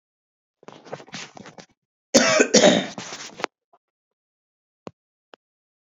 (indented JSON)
{
  "cough_length": "6.0 s",
  "cough_amplitude": 29993,
  "cough_signal_mean_std_ratio": 0.28,
  "survey_phase": "beta (2021-08-13 to 2022-03-07)",
  "age": "45-64",
  "gender": "Male",
  "wearing_mask": "No",
  "symptom_fatigue": true,
  "symptom_headache": true,
  "symptom_loss_of_taste": true,
  "symptom_onset": "3 days",
  "smoker_status": "Ex-smoker",
  "respiratory_condition_asthma": false,
  "respiratory_condition_other": false,
  "recruitment_source": "Test and Trace",
  "submission_delay": "2 days",
  "covid_test_result": "Positive",
  "covid_test_method": "RT-qPCR",
  "covid_ct_value": 26.2,
  "covid_ct_gene": "ORF1ab gene",
  "covid_ct_mean": 27.1,
  "covid_viral_load": "1300 copies/ml",
  "covid_viral_load_category": "Minimal viral load (< 10K copies/ml)"
}